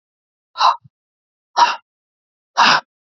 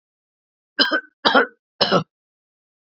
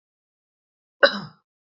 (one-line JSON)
{"exhalation_length": "3.1 s", "exhalation_amplitude": 29675, "exhalation_signal_mean_std_ratio": 0.34, "three_cough_length": "2.9 s", "three_cough_amplitude": 32404, "three_cough_signal_mean_std_ratio": 0.34, "cough_length": "1.8 s", "cough_amplitude": 27746, "cough_signal_mean_std_ratio": 0.18, "survey_phase": "beta (2021-08-13 to 2022-03-07)", "age": "18-44", "gender": "Male", "wearing_mask": "No", "symptom_none": true, "symptom_onset": "8 days", "smoker_status": "Never smoked", "respiratory_condition_asthma": true, "respiratory_condition_other": false, "recruitment_source": "REACT", "submission_delay": "1 day", "covid_test_result": "Negative", "covid_test_method": "RT-qPCR", "influenza_a_test_result": "Negative", "influenza_b_test_result": "Negative"}